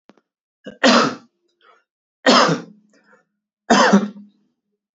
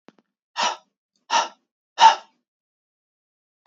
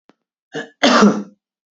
{
  "three_cough_length": "4.9 s",
  "three_cough_amplitude": 29233,
  "three_cough_signal_mean_std_ratio": 0.37,
  "exhalation_length": "3.7 s",
  "exhalation_amplitude": 28073,
  "exhalation_signal_mean_std_ratio": 0.25,
  "cough_length": "1.7 s",
  "cough_amplitude": 31211,
  "cough_signal_mean_std_ratio": 0.41,
  "survey_phase": "beta (2021-08-13 to 2022-03-07)",
  "age": "18-44",
  "gender": "Male",
  "wearing_mask": "No",
  "symptom_none": true,
  "smoker_status": "Never smoked",
  "respiratory_condition_asthma": false,
  "respiratory_condition_other": false,
  "recruitment_source": "REACT",
  "submission_delay": "1 day",
  "covid_test_result": "Negative",
  "covid_test_method": "RT-qPCR",
  "influenza_a_test_result": "Negative",
  "influenza_b_test_result": "Negative"
}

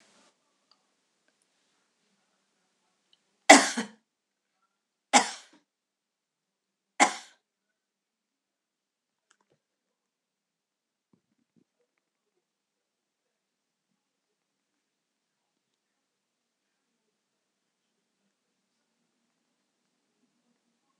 {
  "three_cough_length": "21.0 s",
  "three_cough_amplitude": 26028,
  "three_cough_signal_mean_std_ratio": 0.1,
  "survey_phase": "alpha (2021-03-01 to 2021-08-12)",
  "age": "65+",
  "gender": "Female",
  "wearing_mask": "No",
  "symptom_none": true,
  "smoker_status": "Never smoked",
  "respiratory_condition_asthma": false,
  "respiratory_condition_other": false,
  "recruitment_source": "REACT",
  "submission_delay": "1 day",
  "covid_test_result": "Negative",
  "covid_test_method": "RT-qPCR"
}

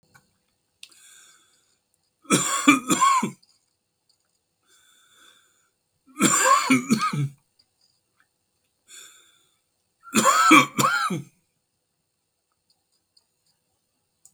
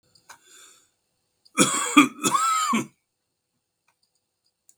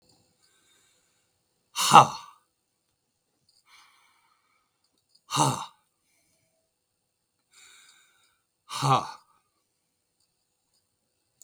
{
  "three_cough_length": "14.3 s",
  "three_cough_amplitude": 32103,
  "three_cough_signal_mean_std_ratio": 0.34,
  "cough_length": "4.8 s",
  "cough_amplitude": 32475,
  "cough_signal_mean_std_ratio": 0.35,
  "exhalation_length": "11.4 s",
  "exhalation_amplitude": 32768,
  "exhalation_signal_mean_std_ratio": 0.18,
  "survey_phase": "beta (2021-08-13 to 2022-03-07)",
  "age": "65+",
  "gender": "Male",
  "wearing_mask": "No",
  "symptom_none": true,
  "smoker_status": "Never smoked",
  "respiratory_condition_asthma": true,
  "respiratory_condition_other": false,
  "recruitment_source": "REACT",
  "submission_delay": "2 days",
  "covid_test_result": "Negative",
  "covid_test_method": "RT-qPCR",
  "influenza_a_test_result": "Negative",
  "influenza_b_test_result": "Negative"
}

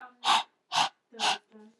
{
  "exhalation_length": "1.8 s",
  "exhalation_amplitude": 8878,
  "exhalation_signal_mean_std_ratio": 0.45,
  "survey_phase": "beta (2021-08-13 to 2022-03-07)",
  "age": "18-44",
  "gender": "Female",
  "wearing_mask": "No",
  "symptom_none": true,
  "smoker_status": "Never smoked",
  "respiratory_condition_asthma": false,
  "respiratory_condition_other": false,
  "recruitment_source": "REACT",
  "submission_delay": "0 days",
  "covid_test_result": "Negative",
  "covid_test_method": "RT-qPCR",
  "influenza_a_test_result": "Negative",
  "influenza_b_test_result": "Negative"
}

